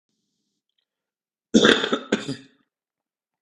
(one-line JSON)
{"cough_length": "3.4 s", "cough_amplitude": 32768, "cough_signal_mean_std_ratio": 0.28, "survey_phase": "beta (2021-08-13 to 2022-03-07)", "age": "18-44", "gender": "Male", "wearing_mask": "No", "symptom_cough_any": true, "symptom_sore_throat": true, "symptom_diarrhoea": true, "symptom_onset": "8 days", "smoker_status": "Ex-smoker", "respiratory_condition_asthma": false, "respiratory_condition_other": false, "recruitment_source": "REACT", "submission_delay": "0 days", "covid_test_result": "Negative", "covid_test_method": "RT-qPCR", "influenza_a_test_result": "Negative", "influenza_b_test_result": "Negative"}